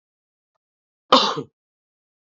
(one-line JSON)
{"cough_length": "2.3 s", "cough_amplitude": 26843, "cough_signal_mean_std_ratio": 0.23, "survey_phase": "alpha (2021-03-01 to 2021-08-12)", "age": "18-44", "gender": "Male", "wearing_mask": "No", "symptom_cough_any": true, "symptom_new_continuous_cough": true, "symptom_fatigue": true, "symptom_headache": true, "smoker_status": "Ex-smoker", "respiratory_condition_asthma": true, "respiratory_condition_other": false, "recruitment_source": "Test and Trace", "submission_delay": "1 day", "covid_test_result": "Positive", "covid_test_method": "RT-qPCR", "covid_ct_value": 19.1, "covid_ct_gene": "ORF1ab gene", "covid_ct_mean": 20.3, "covid_viral_load": "220000 copies/ml", "covid_viral_load_category": "Low viral load (10K-1M copies/ml)"}